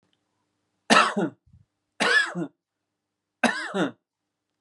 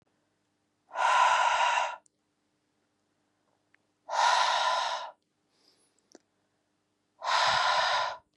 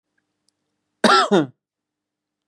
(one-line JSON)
{"three_cough_length": "4.6 s", "three_cough_amplitude": 28336, "three_cough_signal_mean_std_ratio": 0.37, "exhalation_length": "8.4 s", "exhalation_amplitude": 8293, "exhalation_signal_mean_std_ratio": 0.5, "cough_length": "2.5 s", "cough_amplitude": 29529, "cough_signal_mean_std_ratio": 0.31, "survey_phase": "beta (2021-08-13 to 2022-03-07)", "age": "18-44", "gender": "Male", "wearing_mask": "No", "symptom_runny_or_blocked_nose": true, "symptom_headache": true, "smoker_status": "Never smoked", "respiratory_condition_asthma": false, "respiratory_condition_other": false, "recruitment_source": "Test and Trace", "submission_delay": "1 day", "covid_test_result": "Positive", "covid_test_method": "LFT"}